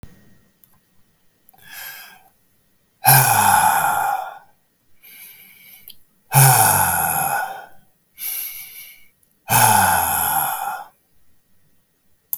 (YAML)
exhalation_length: 12.4 s
exhalation_amplitude: 32768
exhalation_signal_mean_std_ratio: 0.47
survey_phase: beta (2021-08-13 to 2022-03-07)
age: 65+
gender: Male
wearing_mask: 'No'
symptom_none: true
smoker_status: Never smoked
respiratory_condition_asthma: false
respiratory_condition_other: false
recruitment_source: REACT
submission_delay: 4 days
covid_test_result: Negative
covid_test_method: RT-qPCR
influenza_a_test_result: Negative
influenza_b_test_result: Negative